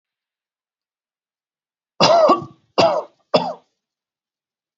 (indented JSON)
{
  "cough_length": "4.8 s",
  "cough_amplitude": 29627,
  "cough_signal_mean_std_ratio": 0.33,
  "survey_phase": "alpha (2021-03-01 to 2021-08-12)",
  "age": "45-64",
  "gender": "Male",
  "wearing_mask": "No",
  "symptom_none": true,
  "smoker_status": "Never smoked",
  "respiratory_condition_asthma": false,
  "respiratory_condition_other": false,
  "recruitment_source": "REACT",
  "submission_delay": "2 days",
  "covid_test_result": "Negative",
  "covid_test_method": "RT-qPCR"
}